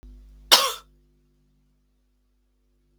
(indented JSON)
{
  "cough_length": "3.0 s",
  "cough_amplitude": 32768,
  "cough_signal_mean_std_ratio": 0.2,
  "survey_phase": "beta (2021-08-13 to 2022-03-07)",
  "age": "18-44",
  "gender": "Female",
  "wearing_mask": "Yes",
  "symptom_cough_any": true,
  "symptom_runny_or_blocked_nose": true,
  "symptom_sore_throat": true,
  "symptom_diarrhoea": true,
  "symptom_fatigue": true,
  "symptom_headache": true,
  "symptom_other": true,
  "symptom_onset": "4 days",
  "smoker_status": "Never smoked",
  "respiratory_condition_asthma": false,
  "respiratory_condition_other": false,
  "recruitment_source": "Test and Trace",
  "submission_delay": "1 day",
  "covid_test_result": "Positive",
  "covid_test_method": "RT-qPCR",
  "covid_ct_value": 17.1,
  "covid_ct_gene": "ORF1ab gene",
  "covid_ct_mean": 17.5,
  "covid_viral_load": "1800000 copies/ml",
  "covid_viral_load_category": "High viral load (>1M copies/ml)"
}